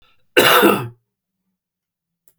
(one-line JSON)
{"cough_length": "2.4 s", "cough_amplitude": 32767, "cough_signal_mean_std_ratio": 0.36, "survey_phase": "beta (2021-08-13 to 2022-03-07)", "age": "65+", "gender": "Male", "wearing_mask": "No", "symptom_cough_any": true, "symptom_runny_or_blocked_nose": true, "symptom_sore_throat": true, "smoker_status": "Never smoked", "respiratory_condition_asthma": false, "respiratory_condition_other": false, "recruitment_source": "Test and Trace", "submission_delay": "1 day", "covid_test_result": "Positive", "covid_test_method": "LFT"}